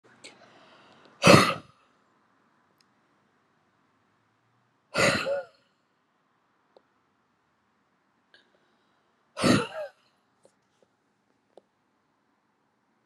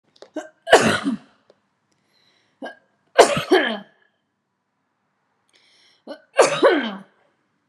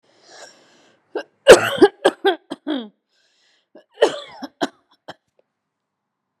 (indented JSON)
{
  "exhalation_length": "13.1 s",
  "exhalation_amplitude": 30707,
  "exhalation_signal_mean_std_ratio": 0.21,
  "three_cough_length": "7.7 s",
  "three_cough_amplitude": 32768,
  "three_cough_signal_mean_std_ratio": 0.31,
  "cough_length": "6.4 s",
  "cough_amplitude": 32768,
  "cough_signal_mean_std_ratio": 0.24,
  "survey_phase": "beta (2021-08-13 to 2022-03-07)",
  "age": "18-44",
  "gender": "Female",
  "wearing_mask": "No",
  "symptom_none": true,
  "smoker_status": "Never smoked",
  "respiratory_condition_asthma": false,
  "respiratory_condition_other": false,
  "recruitment_source": "REACT",
  "submission_delay": "4 days",
  "covid_test_result": "Negative",
  "covid_test_method": "RT-qPCR"
}